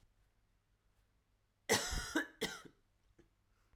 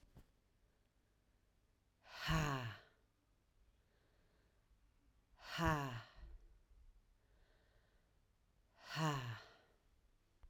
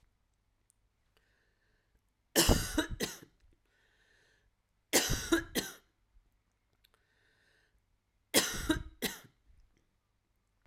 {"cough_length": "3.8 s", "cough_amplitude": 4417, "cough_signal_mean_std_ratio": 0.32, "exhalation_length": "10.5 s", "exhalation_amplitude": 1935, "exhalation_signal_mean_std_ratio": 0.34, "three_cough_length": "10.7 s", "three_cough_amplitude": 9585, "three_cough_signal_mean_std_ratio": 0.29, "survey_phase": "alpha (2021-03-01 to 2021-08-12)", "age": "45-64", "gender": "Female", "wearing_mask": "No", "symptom_cough_any": true, "symptom_shortness_of_breath": true, "symptom_fatigue": true, "symptom_onset": "4 days", "smoker_status": "Never smoked", "respiratory_condition_asthma": false, "respiratory_condition_other": false, "recruitment_source": "Test and Trace", "submission_delay": "2 days", "covid_test_result": "Positive", "covid_test_method": "RT-qPCR", "covid_ct_value": 18.2, "covid_ct_gene": "ORF1ab gene"}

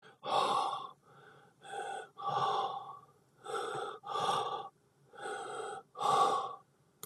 {"exhalation_length": "7.1 s", "exhalation_amplitude": 5079, "exhalation_signal_mean_std_ratio": 0.63, "survey_phase": "beta (2021-08-13 to 2022-03-07)", "age": "45-64", "gender": "Male", "wearing_mask": "No", "symptom_none": true, "smoker_status": "Never smoked", "respiratory_condition_asthma": false, "respiratory_condition_other": false, "recruitment_source": "REACT", "submission_delay": "1 day", "covid_test_result": "Negative", "covid_test_method": "RT-qPCR", "influenza_a_test_result": "Negative", "influenza_b_test_result": "Negative"}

